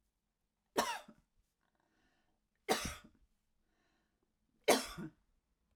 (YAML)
three_cough_length: 5.8 s
three_cough_amplitude: 6215
three_cough_signal_mean_std_ratio: 0.25
survey_phase: alpha (2021-03-01 to 2021-08-12)
age: 65+
gender: Female
wearing_mask: 'No'
symptom_cough_any: true
symptom_onset: 5 days
smoker_status: Never smoked
respiratory_condition_asthma: false
respiratory_condition_other: false
recruitment_source: REACT
submission_delay: 1 day
covid_test_result: Negative
covid_test_method: RT-qPCR